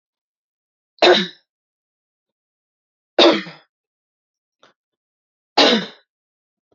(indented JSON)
{
  "three_cough_length": "6.7 s",
  "three_cough_amplitude": 32767,
  "three_cough_signal_mean_std_ratio": 0.25,
  "survey_phase": "beta (2021-08-13 to 2022-03-07)",
  "age": "45-64",
  "gender": "Female",
  "wearing_mask": "No",
  "symptom_none": true,
  "smoker_status": "Never smoked",
  "respiratory_condition_asthma": false,
  "respiratory_condition_other": false,
  "recruitment_source": "REACT",
  "submission_delay": "2 days",
  "covid_test_result": "Negative",
  "covid_test_method": "RT-qPCR"
}